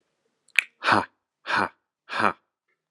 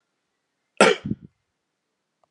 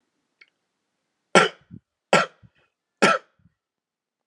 {
  "exhalation_length": "2.9 s",
  "exhalation_amplitude": 32768,
  "exhalation_signal_mean_std_ratio": 0.32,
  "cough_length": "2.3 s",
  "cough_amplitude": 31860,
  "cough_signal_mean_std_ratio": 0.22,
  "three_cough_length": "4.3 s",
  "three_cough_amplitude": 29414,
  "three_cough_signal_mean_std_ratio": 0.23,
  "survey_phase": "beta (2021-08-13 to 2022-03-07)",
  "age": "18-44",
  "gender": "Male",
  "wearing_mask": "No",
  "symptom_sore_throat": true,
  "symptom_fatigue": true,
  "symptom_onset": "4 days",
  "smoker_status": "Never smoked",
  "respiratory_condition_asthma": false,
  "respiratory_condition_other": false,
  "recruitment_source": "Test and Trace",
  "submission_delay": "2 days",
  "covid_test_result": "Positive",
  "covid_test_method": "RT-qPCR",
  "covid_ct_value": 25.0,
  "covid_ct_gene": "N gene",
  "covid_ct_mean": 25.4,
  "covid_viral_load": "4800 copies/ml",
  "covid_viral_load_category": "Minimal viral load (< 10K copies/ml)"
}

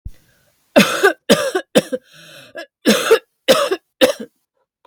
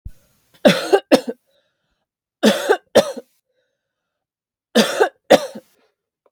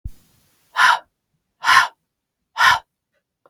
{
  "cough_length": "4.9 s",
  "cough_amplitude": 32768,
  "cough_signal_mean_std_ratio": 0.42,
  "three_cough_length": "6.3 s",
  "three_cough_amplitude": 32768,
  "three_cough_signal_mean_std_ratio": 0.32,
  "exhalation_length": "3.5 s",
  "exhalation_amplitude": 32286,
  "exhalation_signal_mean_std_ratio": 0.35,
  "survey_phase": "beta (2021-08-13 to 2022-03-07)",
  "age": "18-44",
  "gender": "Female",
  "wearing_mask": "No",
  "symptom_other": true,
  "symptom_onset": "10 days",
  "smoker_status": "Never smoked",
  "respiratory_condition_asthma": false,
  "respiratory_condition_other": false,
  "recruitment_source": "REACT",
  "submission_delay": "2 days",
  "covid_test_result": "Negative",
  "covid_test_method": "RT-qPCR",
  "covid_ct_value": 42.0,
  "covid_ct_gene": "N gene"
}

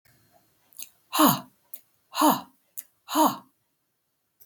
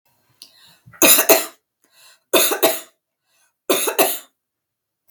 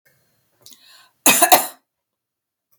{
  "exhalation_length": "4.5 s",
  "exhalation_amplitude": 17659,
  "exhalation_signal_mean_std_ratio": 0.32,
  "three_cough_length": "5.1 s",
  "three_cough_amplitude": 32768,
  "three_cough_signal_mean_std_ratio": 0.37,
  "cough_length": "2.8 s",
  "cough_amplitude": 32768,
  "cough_signal_mean_std_ratio": 0.27,
  "survey_phase": "beta (2021-08-13 to 2022-03-07)",
  "age": "65+",
  "gender": "Female",
  "wearing_mask": "No",
  "symptom_none": true,
  "smoker_status": "Never smoked",
  "respiratory_condition_asthma": false,
  "respiratory_condition_other": false,
  "recruitment_source": "REACT",
  "submission_delay": "1 day",
  "covid_test_result": "Negative",
  "covid_test_method": "RT-qPCR",
  "influenza_a_test_result": "Unknown/Void",
  "influenza_b_test_result": "Unknown/Void"
}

